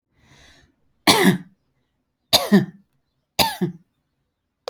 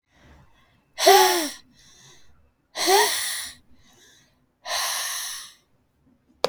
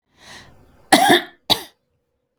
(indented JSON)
{
  "three_cough_length": "4.7 s",
  "three_cough_amplitude": 31756,
  "three_cough_signal_mean_std_ratio": 0.32,
  "exhalation_length": "6.5 s",
  "exhalation_amplitude": 29267,
  "exhalation_signal_mean_std_ratio": 0.38,
  "cough_length": "2.4 s",
  "cough_amplitude": 32767,
  "cough_signal_mean_std_ratio": 0.32,
  "survey_phase": "beta (2021-08-13 to 2022-03-07)",
  "age": "45-64",
  "gender": "Female",
  "wearing_mask": "No",
  "symptom_runny_or_blocked_nose": true,
  "symptom_onset": "12 days",
  "smoker_status": "Never smoked",
  "respiratory_condition_asthma": true,
  "respiratory_condition_other": false,
  "recruitment_source": "REACT",
  "submission_delay": "4 days",
  "covid_test_result": "Negative",
  "covid_test_method": "RT-qPCR"
}